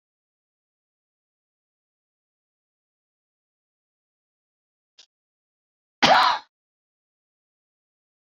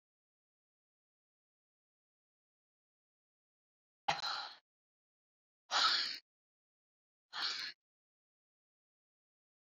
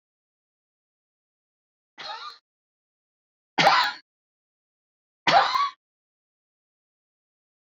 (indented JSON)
{
  "cough_length": "8.4 s",
  "cough_amplitude": 22714,
  "cough_signal_mean_std_ratio": 0.16,
  "exhalation_length": "9.7 s",
  "exhalation_amplitude": 3649,
  "exhalation_signal_mean_std_ratio": 0.25,
  "three_cough_length": "7.8 s",
  "three_cough_amplitude": 18781,
  "three_cough_signal_mean_std_ratio": 0.25,
  "survey_phase": "beta (2021-08-13 to 2022-03-07)",
  "age": "65+",
  "gender": "Female",
  "wearing_mask": "No",
  "symptom_none": true,
  "smoker_status": "Never smoked",
  "respiratory_condition_asthma": false,
  "respiratory_condition_other": false,
  "recruitment_source": "REACT",
  "submission_delay": "1 day",
  "covid_test_result": "Negative",
  "covid_test_method": "RT-qPCR"
}